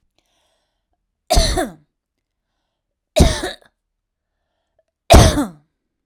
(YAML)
three_cough_length: 6.1 s
three_cough_amplitude: 32768
three_cough_signal_mean_std_ratio: 0.29
survey_phase: alpha (2021-03-01 to 2021-08-12)
age: 18-44
gender: Female
wearing_mask: 'No'
symptom_none: true
smoker_status: Ex-smoker
respiratory_condition_asthma: false
respiratory_condition_other: false
recruitment_source: REACT
submission_delay: 1 day
covid_test_result: Negative
covid_test_method: RT-qPCR